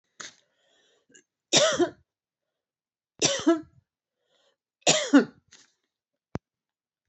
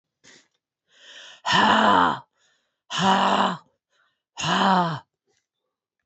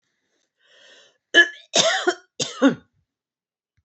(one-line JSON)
{"three_cough_length": "7.1 s", "three_cough_amplitude": 15965, "three_cough_signal_mean_std_ratio": 0.28, "exhalation_length": "6.1 s", "exhalation_amplitude": 20087, "exhalation_signal_mean_std_ratio": 0.46, "cough_length": "3.8 s", "cough_amplitude": 26629, "cough_signal_mean_std_ratio": 0.32, "survey_phase": "beta (2021-08-13 to 2022-03-07)", "age": "65+", "gender": "Female", "wearing_mask": "No", "symptom_none": true, "smoker_status": "Never smoked", "respiratory_condition_asthma": false, "respiratory_condition_other": false, "recruitment_source": "REACT", "submission_delay": "2 days", "covid_test_result": "Negative", "covid_test_method": "RT-qPCR", "influenza_a_test_result": "Negative", "influenza_b_test_result": "Negative"}